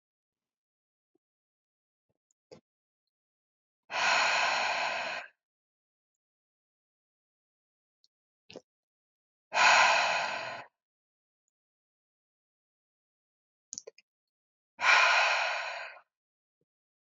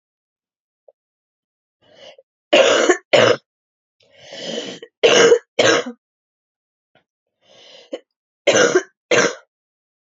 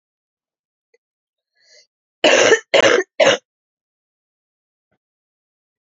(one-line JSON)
{"exhalation_length": "17.1 s", "exhalation_amplitude": 10340, "exhalation_signal_mean_std_ratio": 0.33, "three_cough_length": "10.2 s", "three_cough_amplitude": 31084, "three_cough_signal_mean_std_ratio": 0.36, "cough_length": "5.9 s", "cough_amplitude": 30516, "cough_signal_mean_std_ratio": 0.29, "survey_phase": "beta (2021-08-13 to 2022-03-07)", "age": "18-44", "gender": "Female", "wearing_mask": "No", "symptom_fatigue": true, "smoker_status": "Current smoker (e-cigarettes or vapes only)", "respiratory_condition_asthma": false, "respiratory_condition_other": false, "recruitment_source": "Test and Trace", "submission_delay": "1 day", "covid_test_result": "Positive", "covid_test_method": "RT-qPCR", "covid_ct_value": 15.8, "covid_ct_gene": "ORF1ab gene"}